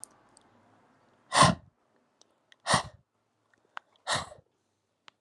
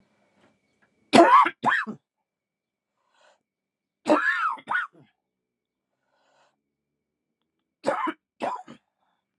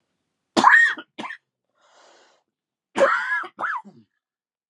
{
  "exhalation_length": "5.2 s",
  "exhalation_amplitude": 15936,
  "exhalation_signal_mean_std_ratio": 0.24,
  "three_cough_length": "9.4 s",
  "three_cough_amplitude": 31963,
  "three_cough_signal_mean_std_ratio": 0.29,
  "cough_length": "4.7 s",
  "cough_amplitude": 29742,
  "cough_signal_mean_std_ratio": 0.36,
  "survey_phase": "alpha (2021-03-01 to 2021-08-12)",
  "age": "18-44",
  "gender": "Male",
  "wearing_mask": "No",
  "symptom_cough_any": true,
  "symptom_fatigue": true,
  "symptom_change_to_sense_of_smell_or_taste": true,
  "symptom_onset": "5 days",
  "smoker_status": "Never smoked",
  "respiratory_condition_asthma": false,
  "respiratory_condition_other": false,
  "recruitment_source": "Test and Trace",
  "submission_delay": "2 days",
  "covid_test_result": "Positive",
  "covid_test_method": "RT-qPCR",
  "covid_ct_value": 15.3,
  "covid_ct_gene": "N gene",
  "covid_ct_mean": 15.5,
  "covid_viral_load": "8600000 copies/ml",
  "covid_viral_load_category": "High viral load (>1M copies/ml)"
}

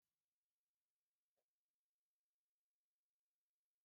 {
  "cough_length": "3.8 s",
  "cough_amplitude": 4,
  "cough_signal_mean_std_ratio": 0.21,
  "survey_phase": "beta (2021-08-13 to 2022-03-07)",
  "age": "65+",
  "gender": "Female",
  "wearing_mask": "No",
  "symptom_none": true,
  "smoker_status": "Ex-smoker",
  "respiratory_condition_asthma": false,
  "respiratory_condition_other": false,
  "recruitment_source": "REACT",
  "submission_delay": "3 days",
  "covid_test_result": "Negative",
  "covid_test_method": "RT-qPCR"
}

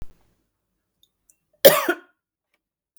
{
  "cough_length": "3.0 s",
  "cough_amplitude": 32768,
  "cough_signal_mean_std_ratio": 0.2,
  "survey_phase": "beta (2021-08-13 to 2022-03-07)",
  "age": "45-64",
  "gender": "Female",
  "wearing_mask": "No",
  "symptom_none": true,
  "smoker_status": "Never smoked",
  "respiratory_condition_asthma": false,
  "respiratory_condition_other": true,
  "recruitment_source": "REACT",
  "submission_delay": "0 days",
  "covid_test_result": "Negative",
  "covid_test_method": "RT-qPCR",
  "influenza_a_test_result": "Negative",
  "influenza_b_test_result": "Negative"
}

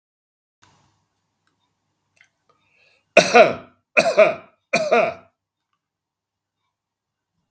{
  "three_cough_length": "7.5 s",
  "three_cough_amplitude": 32767,
  "three_cough_signal_mean_std_ratio": 0.27,
  "survey_phase": "beta (2021-08-13 to 2022-03-07)",
  "age": "65+",
  "gender": "Male",
  "wearing_mask": "No",
  "symptom_none": true,
  "smoker_status": "Ex-smoker",
  "respiratory_condition_asthma": false,
  "respiratory_condition_other": false,
  "recruitment_source": "Test and Trace",
  "submission_delay": "1 day",
  "covid_test_result": "Negative",
  "covid_test_method": "RT-qPCR"
}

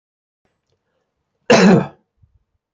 {
  "cough_length": "2.7 s",
  "cough_amplitude": 30918,
  "cough_signal_mean_std_ratio": 0.3,
  "survey_phase": "beta (2021-08-13 to 2022-03-07)",
  "age": "65+",
  "gender": "Male",
  "wearing_mask": "No",
  "symptom_none": true,
  "symptom_onset": "11 days",
  "smoker_status": "Ex-smoker",
  "respiratory_condition_asthma": false,
  "respiratory_condition_other": false,
  "recruitment_source": "REACT",
  "submission_delay": "3 days",
  "covid_test_result": "Negative",
  "covid_test_method": "RT-qPCR",
  "influenza_a_test_result": "Negative",
  "influenza_b_test_result": "Negative"
}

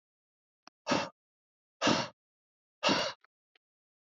{
  "exhalation_length": "4.1 s",
  "exhalation_amplitude": 6563,
  "exhalation_signal_mean_std_ratio": 0.32,
  "survey_phase": "beta (2021-08-13 to 2022-03-07)",
  "age": "45-64",
  "gender": "Male",
  "wearing_mask": "No",
  "symptom_cough_any": true,
  "symptom_new_continuous_cough": true,
  "symptom_runny_or_blocked_nose": true,
  "symptom_shortness_of_breath": true,
  "symptom_headache": true,
  "symptom_change_to_sense_of_smell_or_taste": true,
  "symptom_onset": "3 days",
  "smoker_status": "Ex-smoker",
  "respiratory_condition_asthma": false,
  "respiratory_condition_other": false,
  "recruitment_source": "Test and Trace",
  "submission_delay": "2 days",
  "covid_test_result": "Positive",
  "covid_test_method": "RT-qPCR",
  "covid_ct_value": 14.9,
  "covid_ct_gene": "ORF1ab gene",
  "covid_ct_mean": 16.0,
  "covid_viral_load": "5700000 copies/ml",
  "covid_viral_load_category": "High viral load (>1M copies/ml)"
}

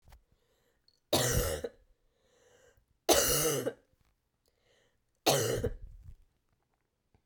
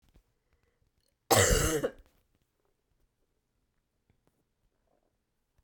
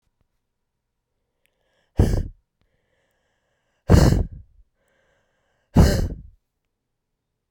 {
  "three_cough_length": "7.3 s",
  "three_cough_amplitude": 12862,
  "three_cough_signal_mean_std_ratio": 0.39,
  "cough_length": "5.6 s",
  "cough_amplitude": 14883,
  "cough_signal_mean_std_ratio": 0.25,
  "exhalation_length": "7.5 s",
  "exhalation_amplitude": 31772,
  "exhalation_signal_mean_std_ratio": 0.27,
  "survey_phase": "beta (2021-08-13 to 2022-03-07)",
  "age": "18-44",
  "gender": "Female",
  "wearing_mask": "No",
  "symptom_cough_any": true,
  "symptom_new_continuous_cough": true,
  "symptom_shortness_of_breath": true,
  "symptom_sore_throat": true,
  "symptom_fatigue": true,
  "symptom_headache": true,
  "symptom_change_to_sense_of_smell_or_taste": true,
  "symptom_loss_of_taste": true,
  "symptom_onset": "2 days",
  "smoker_status": "Never smoked",
  "respiratory_condition_asthma": false,
  "respiratory_condition_other": false,
  "recruitment_source": "Test and Trace",
  "submission_delay": "1 day",
  "covid_test_result": "Positive",
  "covid_test_method": "RT-qPCR"
}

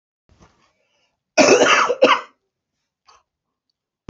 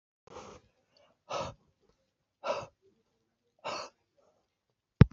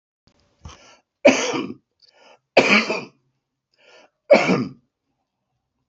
{
  "cough_length": "4.1 s",
  "cough_amplitude": 29807,
  "cough_signal_mean_std_ratio": 0.34,
  "exhalation_length": "5.1 s",
  "exhalation_amplitude": 26324,
  "exhalation_signal_mean_std_ratio": 0.14,
  "three_cough_length": "5.9 s",
  "three_cough_amplitude": 27906,
  "three_cough_signal_mean_std_ratio": 0.32,
  "survey_phase": "beta (2021-08-13 to 2022-03-07)",
  "age": "18-44",
  "gender": "Male",
  "wearing_mask": "No",
  "symptom_sore_throat": true,
  "smoker_status": "Ex-smoker",
  "respiratory_condition_asthma": false,
  "respiratory_condition_other": true,
  "recruitment_source": "REACT",
  "submission_delay": "2 days",
  "covid_test_result": "Negative",
  "covid_test_method": "RT-qPCR",
  "influenza_a_test_result": "Negative",
  "influenza_b_test_result": "Negative"
}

